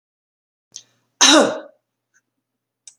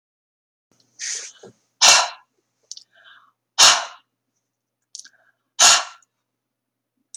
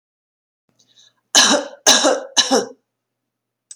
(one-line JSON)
{"cough_length": "3.0 s", "cough_amplitude": 30510, "cough_signal_mean_std_ratio": 0.27, "exhalation_length": "7.2 s", "exhalation_amplitude": 32768, "exhalation_signal_mean_std_ratio": 0.26, "three_cough_length": "3.8 s", "three_cough_amplitude": 32767, "three_cough_signal_mean_std_ratio": 0.38, "survey_phase": "beta (2021-08-13 to 2022-03-07)", "age": "65+", "gender": "Female", "wearing_mask": "No", "symptom_none": true, "smoker_status": "Never smoked", "respiratory_condition_asthma": false, "respiratory_condition_other": false, "recruitment_source": "REACT", "submission_delay": "1 day", "covid_test_result": "Negative", "covid_test_method": "RT-qPCR"}